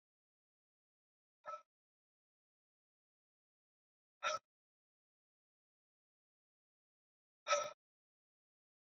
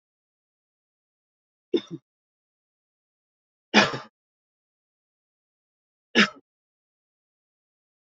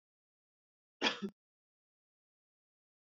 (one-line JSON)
{"exhalation_length": "9.0 s", "exhalation_amplitude": 2395, "exhalation_signal_mean_std_ratio": 0.16, "three_cough_length": "8.1 s", "three_cough_amplitude": 24909, "three_cough_signal_mean_std_ratio": 0.16, "cough_length": "3.2 s", "cough_amplitude": 4354, "cough_signal_mean_std_ratio": 0.19, "survey_phase": "beta (2021-08-13 to 2022-03-07)", "age": "18-44", "gender": "Male", "wearing_mask": "No", "symptom_none": true, "smoker_status": "Never smoked", "respiratory_condition_asthma": false, "respiratory_condition_other": false, "recruitment_source": "Test and Trace", "submission_delay": "2 days", "covid_test_result": "Positive", "covid_test_method": "RT-qPCR", "covid_ct_value": 17.5, "covid_ct_gene": "ORF1ab gene", "covid_ct_mean": 17.8, "covid_viral_load": "1400000 copies/ml", "covid_viral_load_category": "High viral load (>1M copies/ml)"}